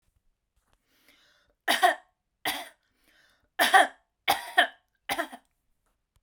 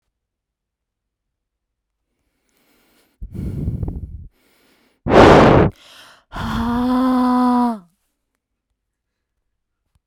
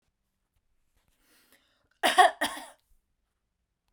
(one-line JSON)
{"three_cough_length": "6.2 s", "three_cough_amplitude": 18420, "three_cough_signal_mean_std_ratio": 0.29, "exhalation_length": "10.1 s", "exhalation_amplitude": 32768, "exhalation_signal_mean_std_ratio": 0.38, "cough_length": "3.9 s", "cough_amplitude": 18546, "cough_signal_mean_std_ratio": 0.22, "survey_phase": "beta (2021-08-13 to 2022-03-07)", "age": "45-64", "gender": "Female", "wearing_mask": "No", "symptom_none": true, "smoker_status": "Never smoked", "respiratory_condition_asthma": false, "respiratory_condition_other": false, "recruitment_source": "REACT", "submission_delay": "1 day", "covid_test_result": "Negative", "covid_test_method": "RT-qPCR"}